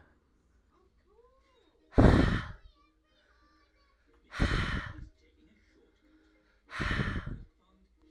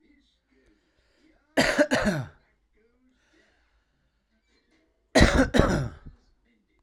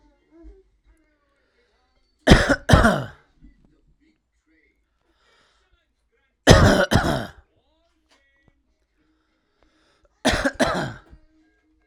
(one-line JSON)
{"exhalation_length": "8.1 s", "exhalation_amplitude": 14518, "exhalation_signal_mean_std_ratio": 0.31, "cough_length": "6.8 s", "cough_amplitude": 24704, "cough_signal_mean_std_ratio": 0.33, "three_cough_length": "11.9 s", "three_cough_amplitude": 32768, "three_cough_signal_mean_std_ratio": 0.28, "survey_phase": "alpha (2021-03-01 to 2021-08-12)", "age": "18-44", "gender": "Male", "wearing_mask": "No", "symptom_none": true, "smoker_status": "Current smoker (11 or more cigarettes per day)", "respiratory_condition_asthma": false, "respiratory_condition_other": false, "recruitment_source": "REACT", "submission_delay": "1 day", "covid_test_result": "Negative", "covid_test_method": "RT-qPCR"}